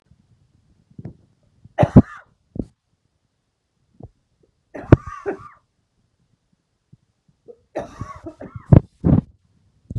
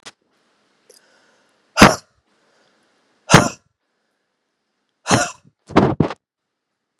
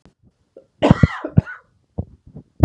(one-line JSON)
{"three_cough_length": "10.0 s", "three_cough_amplitude": 32768, "three_cough_signal_mean_std_ratio": 0.19, "exhalation_length": "7.0 s", "exhalation_amplitude": 32768, "exhalation_signal_mean_std_ratio": 0.24, "cough_length": "2.6 s", "cough_amplitude": 32768, "cough_signal_mean_std_ratio": 0.25, "survey_phase": "beta (2021-08-13 to 2022-03-07)", "age": "45-64", "gender": "Female", "wearing_mask": "No", "symptom_cough_any": true, "symptom_runny_or_blocked_nose": true, "symptom_shortness_of_breath": true, "symptom_fatigue": true, "symptom_change_to_sense_of_smell_or_taste": true, "symptom_other": true, "symptom_onset": "2 days", "smoker_status": "Ex-smoker", "respiratory_condition_asthma": true, "respiratory_condition_other": false, "recruitment_source": "Test and Trace", "submission_delay": "2 days", "covid_test_result": "Positive", "covid_test_method": "ePCR"}